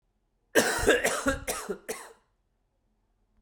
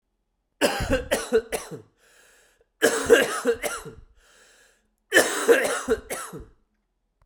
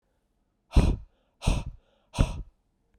{"cough_length": "3.4 s", "cough_amplitude": 14714, "cough_signal_mean_std_ratio": 0.43, "three_cough_length": "7.3 s", "three_cough_amplitude": 22675, "three_cough_signal_mean_std_ratio": 0.44, "exhalation_length": "3.0 s", "exhalation_amplitude": 14876, "exhalation_signal_mean_std_ratio": 0.33, "survey_phase": "beta (2021-08-13 to 2022-03-07)", "age": "45-64", "gender": "Male", "wearing_mask": "No", "symptom_cough_any": true, "symptom_runny_or_blocked_nose": true, "symptom_shortness_of_breath": true, "symptom_sore_throat": true, "symptom_fatigue": true, "symptom_headache": true, "smoker_status": "Ex-smoker", "respiratory_condition_asthma": false, "respiratory_condition_other": false, "recruitment_source": "Test and Trace", "submission_delay": "2 days", "covid_test_result": "Positive", "covid_test_method": "ePCR"}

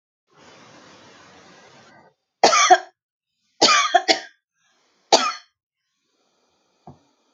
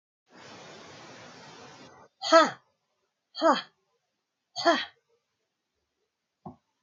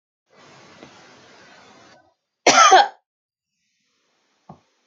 {"three_cough_length": "7.3 s", "three_cough_amplitude": 32360, "three_cough_signal_mean_std_ratio": 0.29, "exhalation_length": "6.8 s", "exhalation_amplitude": 18980, "exhalation_signal_mean_std_ratio": 0.25, "cough_length": "4.9 s", "cough_amplitude": 31886, "cough_signal_mean_std_ratio": 0.24, "survey_phase": "alpha (2021-03-01 to 2021-08-12)", "age": "45-64", "gender": "Female", "wearing_mask": "No", "symptom_none": true, "smoker_status": "Never smoked", "respiratory_condition_asthma": false, "respiratory_condition_other": false, "recruitment_source": "REACT", "submission_delay": "1 day", "covid_test_result": "Negative", "covid_test_method": "RT-qPCR"}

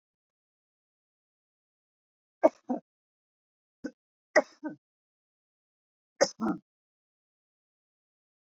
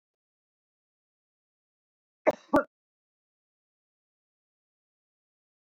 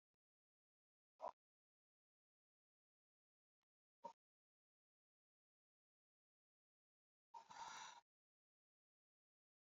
{"three_cough_length": "8.5 s", "three_cough_amplitude": 12372, "three_cough_signal_mean_std_ratio": 0.16, "cough_length": "5.7 s", "cough_amplitude": 10777, "cough_signal_mean_std_ratio": 0.12, "exhalation_length": "9.6 s", "exhalation_amplitude": 341, "exhalation_signal_mean_std_ratio": 0.2, "survey_phase": "beta (2021-08-13 to 2022-03-07)", "age": "65+", "gender": "Female", "wearing_mask": "No", "symptom_cough_any": true, "symptom_runny_or_blocked_nose": true, "symptom_onset": "13 days", "smoker_status": "Never smoked", "respiratory_condition_asthma": false, "respiratory_condition_other": false, "recruitment_source": "REACT", "submission_delay": "1 day", "covid_test_result": "Negative", "covid_test_method": "RT-qPCR"}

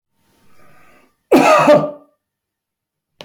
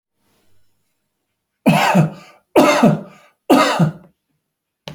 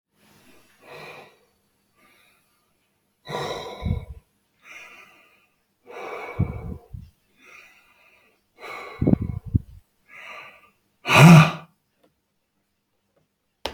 {"cough_length": "3.2 s", "cough_amplitude": 30957, "cough_signal_mean_std_ratio": 0.36, "three_cough_length": "4.9 s", "three_cough_amplitude": 32767, "three_cough_signal_mean_std_ratio": 0.43, "exhalation_length": "13.7 s", "exhalation_amplitude": 28182, "exhalation_signal_mean_std_ratio": 0.23, "survey_phase": "beta (2021-08-13 to 2022-03-07)", "age": "65+", "gender": "Male", "wearing_mask": "No", "symptom_none": true, "smoker_status": "Ex-smoker", "respiratory_condition_asthma": false, "respiratory_condition_other": false, "recruitment_source": "REACT", "submission_delay": "3 days", "covid_test_result": "Negative", "covid_test_method": "RT-qPCR", "covid_ct_value": 41.0, "covid_ct_gene": "N gene"}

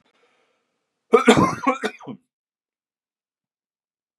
{"cough_length": "4.2 s", "cough_amplitude": 32441, "cough_signal_mean_std_ratio": 0.26, "survey_phase": "beta (2021-08-13 to 2022-03-07)", "age": "45-64", "gender": "Male", "wearing_mask": "No", "symptom_new_continuous_cough": true, "symptom_fatigue": true, "symptom_fever_high_temperature": true, "symptom_headache": true, "symptom_other": true, "symptom_onset": "2 days", "smoker_status": "Never smoked", "respiratory_condition_asthma": false, "respiratory_condition_other": false, "recruitment_source": "Test and Trace", "submission_delay": "2 days", "covid_test_result": "Positive", "covid_test_method": "RT-qPCR", "covid_ct_value": 26.7, "covid_ct_gene": "ORF1ab gene"}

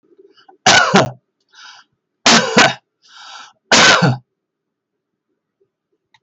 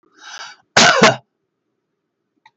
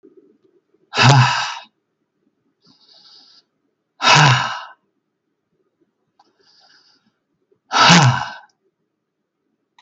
{"three_cough_length": "6.2 s", "three_cough_amplitude": 32768, "three_cough_signal_mean_std_ratio": 0.39, "cough_length": "2.6 s", "cough_amplitude": 32766, "cough_signal_mean_std_ratio": 0.33, "exhalation_length": "9.8 s", "exhalation_amplitude": 32768, "exhalation_signal_mean_std_ratio": 0.32, "survey_phase": "beta (2021-08-13 to 2022-03-07)", "age": "65+", "gender": "Male", "wearing_mask": "No", "symptom_none": true, "smoker_status": "Ex-smoker", "respiratory_condition_asthma": false, "respiratory_condition_other": false, "recruitment_source": "REACT", "submission_delay": "3 days", "covid_test_result": "Negative", "covid_test_method": "RT-qPCR", "influenza_a_test_result": "Negative", "influenza_b_test_result": "Negative"}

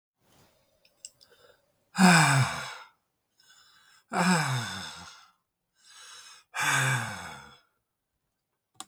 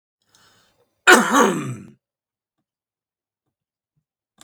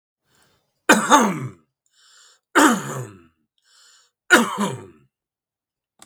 {"exhalation_length": "8.9 s", "exhalation_amplitude": 17152, "exhalation_signal_mean_std_ratio": 0.37, "cough_length": "4.4 s", "cough_amplitude": 32768, "cough_signal_mean_std_ratio": 0.26, "three_cough_length": "6.1 s", "three_cough_amplitude": 32768, "three_cough_signal_mean_std_ratio": 0.34, "survey_phase": "beta (2021-08-13 to 2022-03-07)", "age": "65+", "gender": "Male", "wearing_mask": "No", "symptom_none": true, "smoker_status": "Ex-smoker", "respiratory_condition_asthma": false, "respiratory_condition_other": false, "recruitment_source": "REACT", "submission_delay": "0 days", "covid_test_result": "Negative", "covid_test_method": "RT-qPCR", "influenza_a_test_result": "Negative", "influenza_b_test_result": "Negative"}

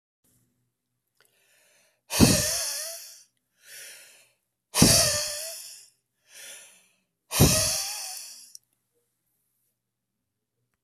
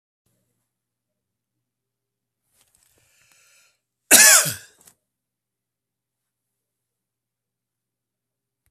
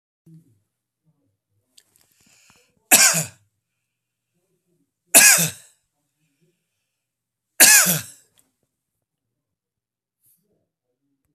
{"exhalation_length": "10.8 s", "exhalation_amplitude": 23896, "exhalation_signal_mean_std_ratio": 0.33, "cough_length": "8.7 s", "cough_amplitude": 32768, "cough_signal_mean_std_ratio": 0.16, "three_cough_length": "11.3 s", "three_cough_amplitude": 32768, "three_cough_signal_mean_std_ratio": 0.23, "survey_phase": "beta (2021-08-13 to 2022-03-07)", "age": "65+", "gender": "Male", "wearing_mask": "No", "symptom_none": true, "smoker_status": "Ex-smoker", "respiratory_condition_asthma": false, "respiratory_condition_other": false, "recruitment_source": "REACT", "submission_delay": "0 days", "covid_test_result": "Negative", "covid_test_method": "RT-qPCR"}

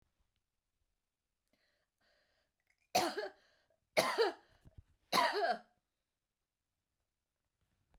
{"three_cough_length": "8.0 s", "three_cough_amplitude": 5377, "three_cough_signal_mean_std_ratio": 0.29, "survey_phase": "beta (2021-08-13 to 2022-03-07)", "age": "65+", "gender": "Female", "wearing_mask": "No", "symptom_headache": true, "smoker_status": "Never smoked", "respiratory_condition_asthma": false, "respiratory_condition_other": false, "recruitment_source": "REACT", "submission_delay": "2 days", "covid_test_result": "Negative", "covid_test_method": "RT-qPCR"}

